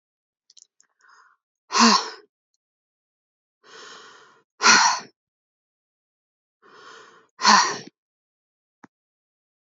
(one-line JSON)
{"exhalation_length": "9.6 s", "exhalation_amplitude": 27726, "exhalation_signal_mean_std_ratio": 0.26, "survey_phase": "beta (2021-08-13 to 2022-03-07)", "age": "18-44", "gender": "Female", "wearing_mask": "No", "symptom_none": true, "symptom_onset": "5 days", "smoker_status": "Never smoked", "respiratory_condition_asthma": false, "respiratory_condition_other": false, "recruitment_source": "Test and Trace", "submission_delay": "3 days", "covid_test_result": "Positive", "covid_test_method": "RT-qPCR", "covid_ct_value": 30.4, "covid_ct_gene": "N gene"}